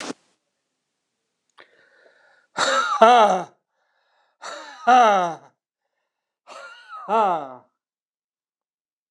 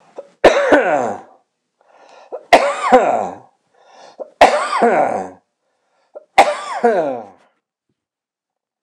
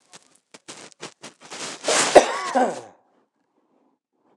{"exhalation_length": "9.1 s", "exhalation_amplitude": 29067, "exhalation_signal_mean_std_ratio": 0.34, "three_cough_length": "8.8 s", "three_cough_amplitude": 29204, "three_cough_signal_mean_std_ratio": 0.44, "cough_length": "4.4 s", "cough_amplitude": 29204, "cough_signal_mean_std_ratio": 0.31, "survey_phase": "beta (2021-08-13 to 2022-03-07)", "age": "65+", "gender": "Male", "wearing_mask": "No", "symptom_none": true, "smoker_status": "Ex-smoker", "respiratory_condition_asthma": false, "respiratory_condition_other": false, "recruitment_source": "REACT", "submission_delay": "1 day", "covid_test_result": "Negative", "covid_test_method": "RT-qPCR"}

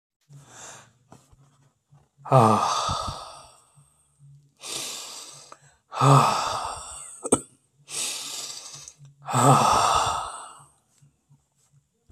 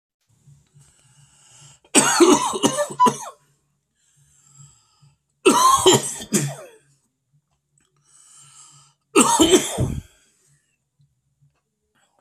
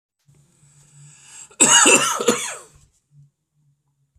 {"exhalation_length": "12.1 s", "exhalation_amplitude": 22837, "exhalation_signal_mean_std_ratio": 0.41, "three_cough_length": "12.2 s", "three_cough_amplitude": 32767, "three_cough_signal_mean_std_ratio": 0.36, "cough_length": "4.2 s", "cough_amplitude": 32241, "cough_signal_mean_std_ratio": 0.35, "survey_phase": "beta (2021-08-13 to 2022-03-07)", "age": "45-64", "gender": "Male", "wearing_mask": "No", "symptom_cough_any": true, "symptom_runny_or_blocked_nose": true, "symptom_sore_throat": true, "symptom_onset": "2 days", "smoker_status": "Never smoked", "respiratory_condition_asthma": true, "respiratory_condition_other": false, "recruitment_source": "Test and Trace", "submission_delay": "2 days", "covid_test_result": "Positive", "covid_test_method": "RT-qPCR", "covid_ct_value": 20.2, "covid_ct_gene": "N gene"}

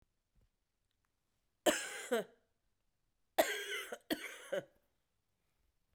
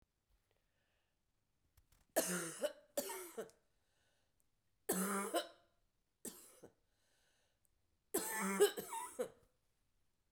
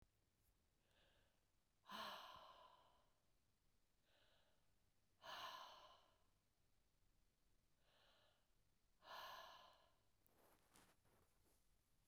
{"cough_length": "5.9 s", "cough_amplitude": 5992, "cough_signal_mean_std_ratio": 0.31, "three_cough_length": "10.3 s", "three_cough_amplitude": 3123, "three_cough_signal_mean_std_ratio": 0.36, "exhalation_length": "12.1 s", "exhalation_amplitude": 241, "exhalation_signal_mean_std_ratio": 0.46, "survey_phase": "beta (2021-08-13 to 2022-03-07)", "age": "65+", "gender": "Female", "wearing_mask": "No", "symptom_cough_any": true, "symptom_runny_or_blocked_nose": true, "symptom_sore_throat": true, "symptom_fatigue": true, "symptom_headache": true, "symptom_onset": "12 days", "smoker_status": "Never smoked", "respiratory_condition_asthma": false, "respiratory_condition_other": false, "recruitment_source": "REACT", "submission_delay": "4 days", "covid_test_result": "Positive", "covid_test_method": "RT-qPCR", "covid_ct_value": 32.0, "covid_ct_gene": "E gene", "influenza_a_test_result": "Negative", "influenza_b_test_result": "Negative"}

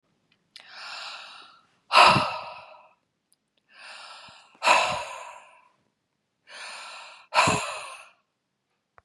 {"exhalation_length": "9.0 s", "exhalation_amplitude": 27528, "exhalation_signal_mean_std_ratio": 0.32, "survey_phase": "beta (2021-08-13 to 2022-03-07)", "age": "45-64", "gender": "Female", "wearing_mask": "No", "symptom_none": true, "smoker_status": "Never smoked", "respiratory_condition_asthma": false, "respiratory_condition_other": false, "recruitment_source": "REACT", "submission_delay": "2 days", "covid_test_result": "Negative", "covid_test_method": "RT-qPCR", "influenza_a_test_result": "Negative", "influenza_b_test_result": "Negative"}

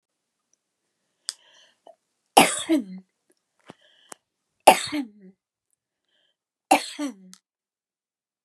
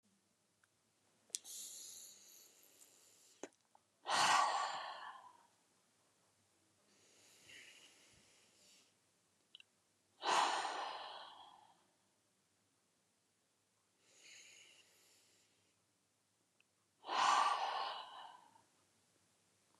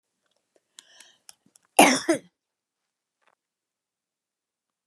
{"three_cough_length": "8.4 s", "three_cough_amplitude": 32768, "three_cough_signal_mean_std_ratio": 0.21, "exhalation_length": "19.8 s", "exhalation_amplitude": 6203, "exhalation_signal_mean_std_ratio": 0.32, "cough_length": "4.9 s", "cough_amplitude": 30251, "cough_signal_mean_std_ratio": 0.18, "survey_phase": "beta (2021-08-13 to 2022-03-07)", "age": "65+", "gender": "Female", "wearing_mask": "No", "symptom_fatigue": true, "symptom_onset": "12 days", "smoker_status": "Never smoked", "respiratory_condition_asthma": false, "respiratory_condition_other": false, "recruitment_source": "REACT", "submission_delay": "0 days", "covid_test_result": "Negative", "covid_test_method": "RT-qPCR", "influenza_a_test_result": "Negative", "influenza_b_test_result": "Negative"}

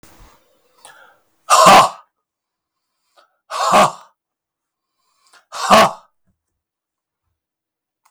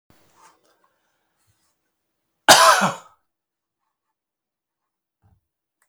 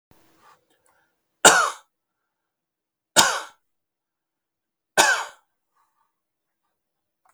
{"exhalation_length": "8.1 s", "exhalation_amplitude": 32768, "exhalation_signal_mean_std_ratio": 0.3, "cough_length": "5.9 s", "cough_amplitude": 32768, "cough_signal_mean_std_ratio": 0.2, "three_cough_length": "7.3 s", "three_cough_amplitude": 32766, "three_cough_signal_mean_std_ratio": 0.23, "survey_phase": "beta (2021-08-13 to 2022-03-07)", "age": "65+", "gender": "Male", "wearing_mask": "No", "symptom_none": true, "smoker_status": "Ex-smoker", "respiratory_condition_asthma": false, "respiratory_condition_other": false, "recruitment_source": "REACT", "submission_delay": "0 days", "covid_test_result": "Positive", "covid_test_method": "RT-qPCR", "covid_ct_value": 30.0, "covid_ct_gene": "E gene", "influenza_a_test_result": "Negative", "influenza_b_test_result": "Negative"}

